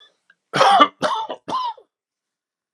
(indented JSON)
{
  "three_cough_length": "2.7 s",
  "three_cough_amplitude": 32767,
  "three_cough_signal_mean_std_ratio": 0.41,
  "survey_phase": "alpha (2021-03-01 to 2021-08-12)",
  "age": "45-64",
  "gender": "Male",
  "wearing_mask": "No",
  "symptom_cough_any": true,
  "symptom_shortness_of_breath": true,
  "symptom_onset": "6 days",
  "smoker_status": "Current smoker (e-cigarettes or vapes only)",
  "respiratory_condition_asthma": false,
  "respiratory_condition_other": true,
  "recruitment_source": "Test and Trace",
  "submission_delay": "2 days",
  "covid_test_result": "Positive",
  "covid_test_method": "RT-qPCR",
  "covid_ct_value": 38.1,
  "covid_ct_gene": "N gene"
}